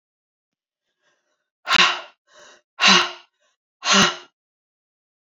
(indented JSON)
{
  "exhalation_length": "5.2 s",
  "exhalation_amplitude": 29191,
  "exhalation_signal_mean_std_ratio": 0.32,
  "survey_phase": "beta (2021-08-13 to 2022-03-07)",
  "age": "45-64",
  "gender": "Female",
  "wearing_mask": "No",
  "symptom_runny_or_blocked_nose": true,
  "symptom_sore_throat": true,
  "symptom_fatigue": true,
  "symptom_loss_of_taste": true,
  "smoker_status": "Never smoked",
  "respiratory_condition_asthma": false,
  "respiratory_condition_other": false,
  "recruitment_source": "Test and Trace",
  "submission_delay": "2 days",
  "covid_test_result": "Positive",
  "covid_test_method": "LFT"
}